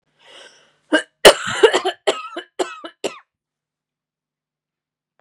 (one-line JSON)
{"cough_length": "5.2 s", "cough_amplitude": 32768, "cough_signal_mean_std_ratio": 0.27, "survey_phase": "beta (2021-08-13 to 2022-03-07)", "age": "45-64", "gender": "Female", "wearing_mask": "No", "symptom_cough_any": true, "symptom_runny_or_blocked_nose": true, "symptom_fatigue": true, "symptom_onset": "4 days", "smoker_status": "Never smoked", "respiratory_condition_asthma": false, "respiratory_condition_other": false, "recruitment_source": "Test and Trace", "submission_delay": "2 days", "covid_test_result": "Positive", "covid_test_method": "RT-qPCR", "covid_ct_value": 18.3, "covid_ct_gene": "N gene"}